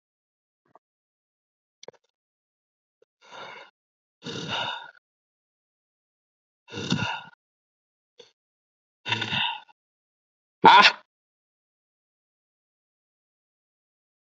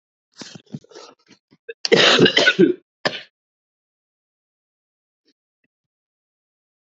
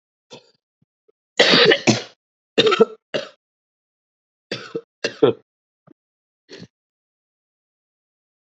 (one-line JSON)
{"exhalation_length": "14.3 s", "exhalation_amplitude": 27302, "exhalation_signal_mean_std_ratio": 0.19, "cough_length": "7.0 s", "cough_amplitude": 29996, "cough_signal_mean_std_ratio": 0.27, "three_cough_length": "8.5 s", "three_cough_amplitude": 30158, "three_cough_signal_mean_std_ratio": 0.28, "survey_phase": "alpha (2021-03-01 to 2021-08-12)", "age": "18-44", "gender": "Male", "wearing_mask": "No", "symptom_cough_any": true, "symptom_fatigue": true, "symptom_headache": true, "smoker_status": "Never smoked", "respiratory_condition_asthma": false, "respiratory_condition_other": false, "recruitment_source": "Test and Trace", "submission_delay": "1 day", "covid_test_result": "Positive", "covid_test_method": "RT-qPCR", "covid_ct_value": 16.4, "covid_ct_gene": "ORF1ab gene", "covid_ct_mean": 17.2, "covid_viral_load": "2300000 copies/ml", "covid_viral_load_category": "High viral load (>1M copies/ml)"}